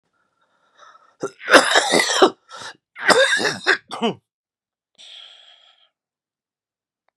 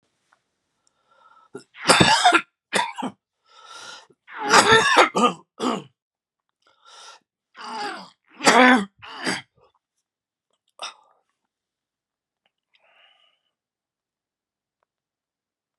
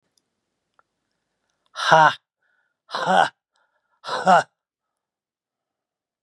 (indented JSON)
{
  "cough_length": "7.2 s",
  "cough_amplitude": 32768,
  "cough_signal_mean_std_ratio": 0.36,
  "three_cough_length": "15.8 s",
  "three_cough_amplitude": 32767,
  "three_cough_signal_mean_std_ratio": 0.3,
  "exhalation_length": "6.2 s",
  "exhalation_amplitude": 31709,
  "exhalation_signal_mean_std_ratio": 0.27,
  "survey_phase": "beta (2021-08-13 to 2022-03-07)",
  "age": "65+",
  "gender": "Male",
  "wearing_mask": "No",
  "symptom_cough_any": true,
  "symptom_runny_or_blocked_nose": true,
  "symptom_shortness_of_breath": true,
  "symptom_fatigue": true,
  "smoker_status": "Ex-smoker",
  "respiratory_condition_asthma": false,
  "respiratory_condition_other": false,
  "recruitment_source": "Test and Trace",
  "submission_delay": "1 day",
  "covid_test_result": "Positive",
  "covid_test_method": "RT-qPCR",
  "covid_ct_value": 14.6,
  "covid_ct_gene": "ORF1ab gene",
  "covid_ct_mean": 15.1,
  "covid_viral_load": "11000000 copies/ml",
  "covid_viral_load_category": "High viral load (>1M copies/ml)"
}